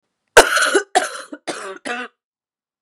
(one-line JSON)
{"cough_length": "2.8 s", "cough_amplitude": 32768, "cough_signal_mean_std_ratio": 0.37, "survey_phase": "beta (2021-08-13 to 2022-03-07)", "age": "18-44", "gender": "Female", "wearing_mask": "No", "symptom_cough_any": true, "symptom_runny_or_blocked_nose": true, "symptom_shortness_of_breath": true, "symptom_fatigue": true, "symptom_fever_high_temperature": true, "symptom_headache": true, "symptom_change_to_sense_of_smell_or_taste": true, "symptom_loss_of_taste": true, "symptom_other": true, "symptom_onset": "3 days", "smoker_status": "Ex-smoker", "respiratory_condition_asthma": false, "respiratory_condition_other": false, "recruitment_source": "Test and Trace", "submission_delay": "2 days", "covid_test_result": "Positive", "covid_test_method": "RT-qPCR", "covid_ct_value": 31.4, "covid_ct_gene": "ORF1ab gene"}